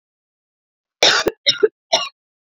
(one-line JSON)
{"cough_length": "2.6 s", "cough_amplitude": 32768, "cough_signal_mean_std_ratio": 0.34, "survey_phase": "beta (2021-08-13 to 2022-03-07)", "age": "45-64", "gender": "Female", "wearing_mask": "No", "symptom_runny_or_blocked_nose": true, "symptom_shortness_of_breath": true, "symptom_sore_throat": true, "symptom_fatigue": true, "symptom_fever_high_temperature": true, "symptom_headache": true, "smoker_status": "Never smoked", "respiratory_condition_asthma": false, "respiratory_condition_other": false, "recruitment_source": "Test and Trace", "submission_delay": "2 days", "covid_test_result": "Positive", "covid_test_method": "ePCR"}